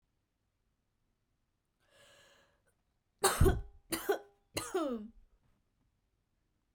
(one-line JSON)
{"three_cough_length": "6.7 s", "three_cough_amplitude": 6495, "three_cough_signal_mean_std_ratio": 0.27, "survey_phase": "beta (2021-08-13 to 2022-03-07)", "age": "18-44", "gender": "Female", "wearing_mask": "No", "symptom_cough_any": true, "symptom_new_continuous_cough": true, "symptom_runny_or_blocked_nose": true, "symptom_sore_throat": true, "symptom_fatigue": true, "symptom_fever_high_temperature": true, "symptom_onset": "7 days", "smoker_status": "Ex-smoker", "respiratory_condition_asthma": false, "respiratory_condition_other": false, "recruitment_source": "Test and Trace", "submission_delay": "1 day", "covid_test_result": "Positive", "covid_test_method": "RT-qPCR", "covid_ct_value": 18.2, "covid_ct_gene": "ORF1ab gene", "covid_ct_mean": 18.6, "covid_viral_load": "810000 copies/ml", "covid_viral_load_category": "Low viral load (10K-1M copies/ml)"}